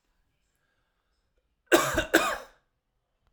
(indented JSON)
{
  "cough_length": "3.3 s",
  "cough_amplitude": 20501,
  "cough_signal_mean_std_ratio": 0.29,
  "survey_phase": "alpha (2021-03-01 to 2021-08-12)",
  "age": "18-44",
  "gender": "Male",
  "wearing_mask": "No",
  "symptom_none": true,
  "smoker_status": "Never smoked",
  "respiratory_condition_asthma": false,
  "respiratory_condition_other": false,
  "recruitment_source": "REACT",
  "submission_delay": "2 days",
  "covid_test_result": "Negative",
  "covid_test_method": "RT-qPCR"
}